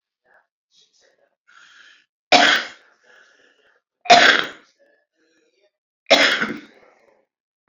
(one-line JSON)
{"three_cough_length": "7.7 s", "three_cough_amplitude": 29693, "three_cough_signal_mean_std_ratio": 0.29, "survey_phase": "beta (2021-08-13 to 2022-03-07)", "age": "45-64", "gender": "Female", "wearing_mask": "No", "symptom_none": true, "smoker_status": "Current smoker (11 or more cigarettes per day)", "respiratory_condition_asthma": false, "respiratory_condition_other": false, "recruitment_source": "REACT", "submission_delay": "10 days", "covid_test_result": "Negative", "covid_test_method": "RT-qPCR"}